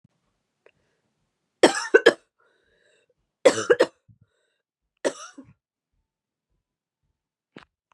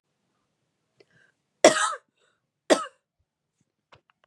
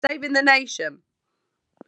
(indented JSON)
{
  "three_cough_length": "7.9 s",
  "three_cough_amplitude": 28560,
  "three_cough_signal_mean_std_ratio": 0.19,
  "cough_length": "4.3 s",
  "cough_amplitude": 31384,
  "cough_signal_mean_std_ratio": 0.2,
  "exhalation_length": "1.9 s",
  "exhalation_amplitude": 23993,
  "exhalation_signal_mean_std_ratio": 0.44,
  "survey_phase": "beta (2021-08-13 to 2022-03-07)",
  "age": "18-44",
  "gender": "Female",
  "wearing_mask": "No",
  "symptom_cough_any": true,
  "symptom_runny_or_blocked_nose": true,
  "symptom_other": true,
  "smoker_status": "Ex-smoker",
  "respiratory_condition_asthma": false,
  "respiratory_condition_other": false,
  "recruitment_source": "Test and Trace",
  "submission_delay": "2 days",
  "covid_test_result": "Positive",
  "covid_test_method": "RT-qPCR"
}